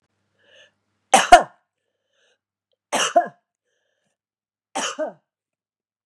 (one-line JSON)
{"three_cough_length": "6.1 s", "three_cough_amplitude": 32768, "three_cough_signal_mean_std_ratio": 0.22, "survey_phase": "beta (2021-08-13 to 2022-03-07)", "age": "45-64", "gender": "Female", "wearing_mask": "No", "symptom_runny_or_blocked_nose": true, "symptom_sore_throat": true, "smoker_status": "Never smoked", "respiratory_condition_asthma": false, "respiratory_condition_other": false, "recruitment_source": "REACT", "submission_delay": "1 day", "covid_test_result": "Negative", "covid_test_method": "RT-qPCR", "influenza_a_test_result": "Unknown/Void", "influenza_b_test_result": "Unknown/Void"}